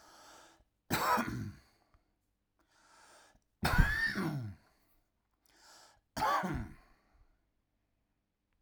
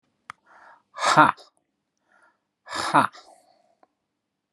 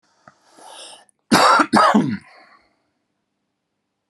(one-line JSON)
{"three_cough_length": "8.6 s", "three_cough_amplitude": 8155, "three_cough_signal_mean_std_ratio": 0.37, "exhalation_length": "4.5 s", "exhalation_amplitude": 29813, "exhalation_signal_mean_std_ratio": 0.25, "cough_length": "4.1 s", "cough_amplitude": 29757, "cough_signal_mean_std_ratio": 0.36, "survey_phase": "alpha (2021-03-01 to 2021-08-12)", "age": "45-64", "gender": "Male", "wearing_mask": "No", "symptom_none": true, "smoker_status": "Never smoked", "respiratory_condition_asthma": false, "respiratory_condition_other": false, "recruitment_source": "REACT", "submission_delay": "2 days", "covid_test_result": "Negative", "covid_test_method": "RT-qPCR"}